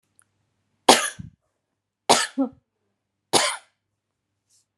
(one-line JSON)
{"three_cough_length": "4.8 s", "three_cough_amplitude": 32768, "three_cough_signal_mean_std_ratio": 0.26, "survey_phase": "alpha (2021-03-01 to 2021-08-12)", "age": "45-64", "gender": "Female", "wearing_mask": "No", "symptom_none": true, "smoker_status": "Never smoked", "respiratory_condition_asthma": false, "respiratory_condition_other": false, "recruitment_source": "REACT", "submission_delay": "2 days", "covid_test_result": "Negative", "covid_test_method": "RT-qPCR"}